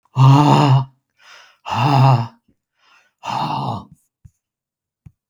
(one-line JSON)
{"exhalation_length": "5.3 s", "exhalation_amplitude": 32768, "exhalation_signal_mean_std_ratio": 0.46, "survey_phase": "beta (2021-08-13 to 2022-03-07)", "age": "65+", "gender": "Male", "wearing_mask": "No", "symptom_none": true, "smoker_status": "Ex-smoker", "respiratory_condition_asthma": false, "respiratory_condition_other": false, "recruitment_source": "REACT", "submission_delay": "2 days", "covid_test_result": "Positive", "covid_test_method": "RT-qPCR", "covid_ct_value": 31.7, "covid_ct_gene": "E gene", "influenza_a_test_result": "Negative", "influenza_b_test_result": "Negative"}